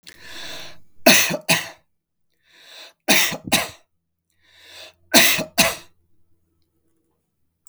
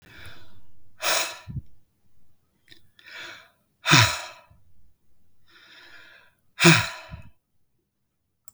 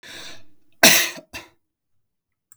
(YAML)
three_cough_length: 7.7 s
three_cough_amplitude: 32768
three_cough_signal_mean_std_ratio: 0.34
exhalation_length: 8.5 s
exhalation_amplitude: 32768
exhalation_signal_mean_std_ratio: 0.31
cough_length: 2.6 s
cough_amplitude: 32768
cough_signal_mean_std_ratio: 0.29
survey_phase: beta (2021-08-13 to 2022-03-07)
age: 65+
gender: Male
wearing_mask: 'No'
symptom_none: true
smoker_status: Never smoked
respiratory_condition_asthma: false
respiratory_condition_other: false
recruitment_source: REACT
submission_delay: 0 days
covid_test_result: Negative
covid_test_method: RT-qPCR